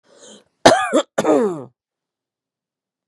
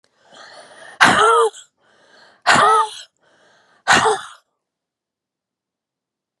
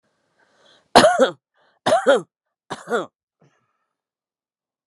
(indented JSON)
{
  "cough_length": "3.1 s",
  "cough_amplitude": 32768,
  "cough_signal_mean_std_ratio": 0.36,
  "exhalation_length": "6.4 s",
  "exhalation_amplitude": 32768,
  "exhalation_signal_mean_std_ratio": 0.38,
  "three_cough_length": "4.9 s",
  "three_cough_amplitude": 32768,
  "three_cough_signal_mean_std_ratio": 0.3,
  "survey_phase": "beta (2021-08-13 to 2022-03-07)",
  "age": "45-64",
  "gender": "Female",
  "wearing_mask": "No",
  "symptom_none": true,
  "smoker_status": "Never smoked",
  "respiratory_condition_asthma": false,
  "respiratory_condition_other": false,
  "recruitment_source": "REACT",
  "submission_delay": "15 days",
  "covid_test_result": "Negative",
  "covid_test_method": "RT-qPCR"
}